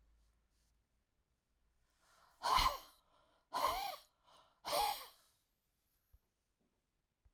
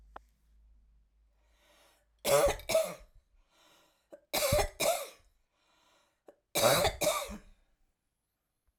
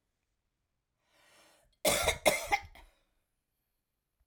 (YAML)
exhalation_length: 7.3 s
exhalation_amplitude: 3148
exhalation_signal_mean_std_ratio: 0.31
three_cough_length: 8.8 s
three_cough_amplitude: 7861
three_cough_signal_mean_std_ratio: 0.38
cough_length: 4.3 s
cough_amplitude: 9925
cough_signal_mean_std_ratio: 0.28
survey_phase: alpha (2021-03-01 to 2021-08-12)
age: 65+
gender: Female
wearing_mask: 'No'
symptom_none: true
smoker_status: Never smoked
respiratory_condition_asthma: false
respiratory_condition_other: false
recruitment_source: REACT
submission_delay: 2 days
covid_test_result: Negative
covid_test_method: RT-qPCR